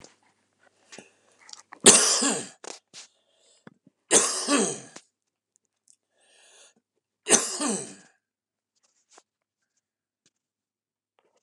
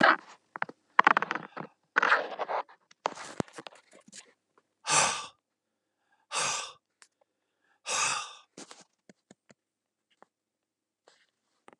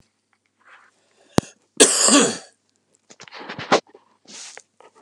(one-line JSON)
{"three_cough_length": "11.4 s", "three_cough_amplitude": 32246, "three_cough_signal_mean_std_ratio": 0.27, "exhalation_length": "11.8 s", "exhalation_amplitude": 24810, "exhalation_signal_mean_std_ratio": 0.28, "cough_length": "5.0 s", "cough_amplitude": 32767, "cough_signal_mean_std_ratio": 0.3, "survey_phase": "beta (2021-08-13 to 2022-03-07)", "age": "65+", "gender": "Male", "wearing_mask": "No", "symptom_cough_any": true, "symptom_other": true, "symptom_onset": "3 days", "smoker_status": "Never smoked", "respiratory_condition_asthma": false, "respiratory_condition_other": false, "recruitment_source": "Test and Trace", "submission_delay": "1 day", "covid_test_result": "Positive", "covid_test_method": "RT-qPCR", "covid_ct_value": 16.8, "covid_ct_gene": "ORF1ab gene", "covid_ct_mean": 17.2, "covid_viral_load": "2300000 copies/ml", "covid_viral_load_category": "High viral load (>1M copies/ml)"}